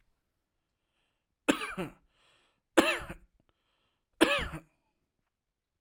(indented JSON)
{
  "three_cough_length": "5.8 s",
  "three_cough_amplitude": 16094,
  "three_cough_signal_mean_std_ratio": 0.25,
  "survey_phase": "alpha (2021-03-01 to 2021-08-12)",
  "age": "18-44",
  "gender": "Male",
  "wearing_mask": "No",
  "symptom_none": true,
  "smoker_status": "Never smoked",
  "respiratory_condition_asthma": false,
  "respiratory_condition_other": false,
  "recruitment_source": "REACT",
  "submission_delay": "2 days",
  "covid_test_result": "Negative",
  "covid_test_method": "RT-qPCR"
}